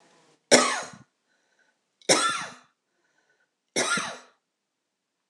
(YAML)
three_cough_length: 5.3 s
three_cough_amplitude: 25119
three_cough_signal_mean_std_ratio: 0.31
survey_phase: alpha (2021-03-01 to 2021-08-12)
age: 45-64
gender: Female
wearing_mask: 'No'
symptom_none: true
smoker_status: Never smoked
respiratory_condition_asthma: false
respiratory_condition_other: false
recruitment_source: REACT
submission_delay: 1 day
covid_test_result: Negative
covid_test_method: RT-qPCR